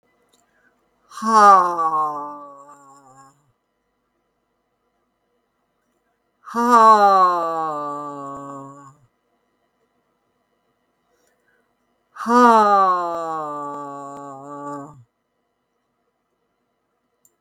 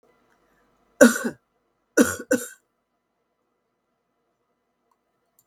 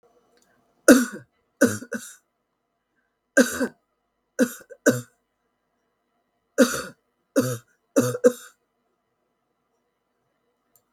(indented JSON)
{
  "exhalation_length": "17.4 s",
  "exhalation_amplitude": 32768,
  "exhalation_signal_mean_std_ratio": 0.37,
  "cough_length": "5.5 s",
  "cough_amplitude": 32768,
  "cough_signal_mean_std_ratio": 0.2,
  "three_cough_length": "10.9 s",
  "three_cough_amplitude": 32768,
  "three_cough_signal_mean_std_ratio": 0.26,
  "survey_phase": "alpha (2021-03-01 to 2021-08-12)",
  "age": "65+",
  "gender": "Female",
  "wearing_mask": "No",
  "symptom_none": true,
  "symptom_onset": "12 days",
  "smoker_status": "Never smoked",
  "respiratory_condition_asthma": false,
  "respiratory_condition_other": false,
  "recruitment_source": "REACT",
  "submission_delay": "1 day",
  "covid_test_result": "Negative",
  "covid_test_method": "RT-qPCR"
}